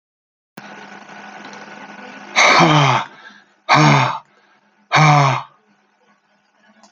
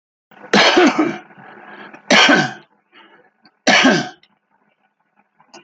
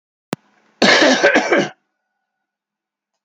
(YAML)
exhalation_length: 6.9 s
exhalation_amplitude: 32767
exhalation_signal_mean_std_ratio: 0.44
three_cough_length: 5.6 s
three_cough_amplitude: 29389
three_cough_signal_mean_std_ratio: 0.42
cough_length: 3.2 s
cough_amplitude: 32768
cough_signal_mean_std_ratio: 0.42
survey_phase: alpha (2021-03-01 to 2021-08-12)
age: 65+
gender: Male
wearing_mask: 'No'
symptom_none: true
smoker_status: Ex-smoker
respiratory_condition_asthma: false
respiratory_condition_other: false
recruitment_source: REACT
submission_delay: 2 days
covid_test_result: Negative
covid_test_method: RT-qPCR